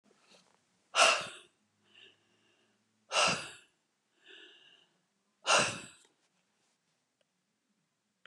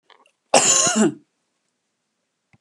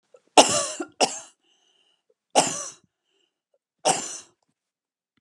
{"exhalation_length": "8.3 s", "exhalation_amplitude": 8723, "exhalation_signal_mean_std_ratio": 0.26, "cough_length": "2.6 s", "cough_amplitude": 31941, "cough_signal_mean_std_ratio": 0.38, "three_cough_length": "5.2 s", "three_cough_amplitude": 32075, "three_cough_signal_mean_std_ratio": 0.28, "survey_phase": "beta (2021-08-13 to 2022-03-07)", "age": "65+", "gender": "Female", "wearing_mask": "No", "symptom_none": true, "smoker_status": "Never smoked", "respiratory_condition_asthma": false, "respiratory_condition_other": false, "recruitment_source": "REACT", "submission_delay": "5 days", "covid_test_result": "Negative", "covid_test_method": "RT-qPCR"}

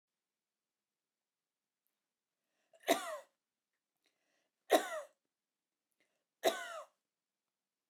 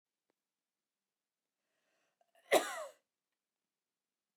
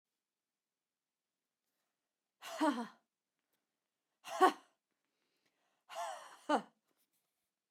{"three_cough_length": "7.9 s", "three_cough_amplitude": 6468, "three_cough_signal_mean_std_ratio": 0.2, "cough_length": "4.4 s", "cough_amplitude": 4967, "cough_signal_mean_std_ratio": 0.17, "exhalation_length": "7.7 s", "exhalation_amplitude": 6169, "exhalation_signal_mean_std_ratio": 0.22, "survey_phase": "beta (2021-08-13 to 2022-03-07)", "age": "45-64", "gender": "Female", "wearing_mask": "No", "symptom_none": true, "smoker_status": "Never smoked", "respiratory_condition_asthma": true, "respiratory_condition_other": false, "recruitment_source": "REACT", "submission_delay": "2 days", "covid_test_result": "Negative", "covid_test_method": "RT-qPCR", "influenza_a_test_result": "Negative", "influenza_b_test_result": "Negative"}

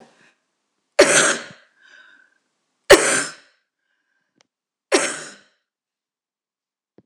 {"three_cough_length": "7.1 s", "three_cough_amplitude": 26028, "three_cough_signal_mean_std_ratio": 0.26, "survey_phase": "beta (2021-08-13 to 2022-03-07)", "age": "65+", "gender": "Female", "wearing_mask": "No", "symptom_none": true, "smoker_status": "Never smoked", "respiratory_condition_asthma": false, "respiratory_condition_other": false, "recruitment_source": "REACT", "submission_delay": "2 days", "covid_test_result": "Negative", "covid_test_method": "RT-qPCR", "influenza_a_test_result": "Negative", "influenza_b_test_result": "Negative"}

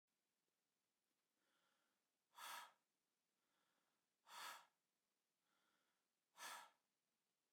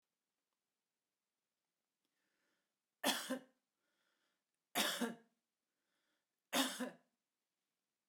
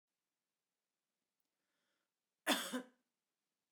{"exhalation_length": "7.5 s", "exhalation_amplitude": 242, "exhalation_signal_mean_std_ratio": 0.31, "three_cough_length": "8.1 s", "three_cough_amplitude": 2550, "three_cough_signal_mean_std_ratio": 0.27, "cough_length": "3.7 s", "cough_amplitude": 2943, "cough_signal_mean_std_ratio": 0.21, "survey_phase": "beta (2021-08-13 to 2022-03-07)", "age": "45-64", "gender": "Female", "wearing_mask": "No", "symptom_cough_any": true, "symptom_runny_or_blocked_nose": true, "symptom_onset": "4 days", "smoker_status": "Never smoked", "respiratory_condition_asthma": false, "respiratory_condition_other": false, "recruitment_source": "REACT", "submission_delay": "5 days", "covid_test_result": "Negative", "covid_test_method": "RT-qPCR", "influenza_a_test_result": "Negative", "influenza_b_test_result": "Negative"}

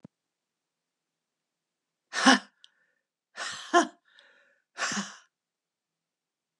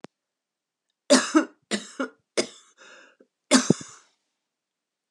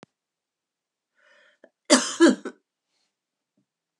{"exhalation_length": "6.6 s", "exhalation_amplitude": 22199, "exhalation_signal_mean_std_ratio": 0.22, "three_cough_length": "5.1 s", "three_cough_amplitude": 26173, "three_cough_signal_mean_std_ratio": 0.27, "cough_length": "4.0 s", "cough_amplitude": 26603, "cough_signal_mean_std_ratio": 0.22, "survey_phase": "beta (2021-08-13 to 2022-03-07)", "age": "65+", "gender": "Female", "wearing_mask": "No", "symptom_cough_any": true, "symptom_new_continuous_cough": true, "symptom_runny_or_blocked_nose": true, "symptom_shortness_of_breath": true, "symptom_sore_throat": true, "symptom_fatigue": true, "symptom_fever_high_temperature": true, "symptom_headache": true, "symptom_change_to_sense_of_smell_or_taste": true, "symptom_loss_of_taste": true, "symptom_other": true, "symptom_onset": "6 days", "smoker_status": "Ex-smoker", "respiratory_condition_asthma": false, "respiratory_condition_other": false, "recruitment_source": "Test and Trace", "submission_delay": "2 days", "covid_test_result": "Positive", "covid_test_method": "RT-qPCR"}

